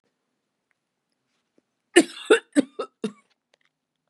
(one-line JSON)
{"three_cough_length": "4.1 s", "three_cough_amplitude": 29856, "three_cough_signal_mean_std_ratio": 0.2, "survey_phase": "beta (2021-08-13 to 2022-03-07)", "age": "45-64", "gender": "Female", "wearing_mask": "No", "symptom_cough_any": true, "symptom_runny_or_blocked_nose": true, "symptom_fatigue": true, "symptom_onset": "3 days", "smoker_status": "Ex-smoker", "respiratory_condition_asthma": false, "respiratory_condition_other": false, "recruitment_source": "Test and Trace", "submission_delay": "2 days", "covid_test_result": "Positive", "covid_test_method": "RT-qPCR"}